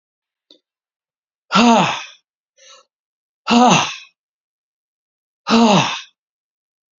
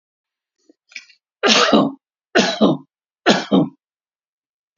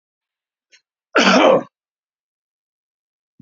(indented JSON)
{
  "exhalation_length": "7.0 s",
  "exhalation_amplitude": 31499,
  "exhalation_signal_mean_std_ratio": 0.36,
  "three_cough_length": "4.8 s",
  "three_cough_amplitude": 32569,
  "three_cough_signal_mean_std_ratio": 0.4,
  "cough_length": "3.4 s",
  "cough_amplitude": 28611,
  "cough_signal_mean_std_ratio": 0.3,
  "survey_phase": "beta (2021-08-13 to 2022-03-07)",
  "age": "65+",
  "gender": "Male",
  "wearing_mask": "No",
  "symptom_none": true,
  "smoker_status": "Ex-smoker",
  "respiratory_condition_asthma": false,
  "respiratory_condition_other": false,
  "recruitment_source": "REACT",
  "submission_delay": "6 days",
  "covid_test_result": "Negative",
  "covid_test_method": "RT-qPCR",
  "influenza_a_test_result": "Negative",
  "influenza_b_test_result": "Negative"
}